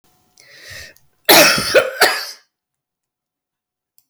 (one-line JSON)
{"cough_length": "4.1 s", "cough_amplitude": 32768, "cough_signal_mean_std_ratio": 0.35, "survey_phase": "beta (2021-08-13 to 2022-03-07)", "age": "65+", "gender": "Female", "wearing_mask": "No", "symptom_cough_any": true, "smoker_status": "Never smoked", "respiratory_condition_asthma": false, "respiratory_condition_other": true, "recruitment_source": "REACT", "submission_delay": "2 days", "covid_test_result": "Negative", "covid_test_method": "RT-qPCR", "influenza_a_test_result": "Negative", "influenza_b_test_result": "Negative"}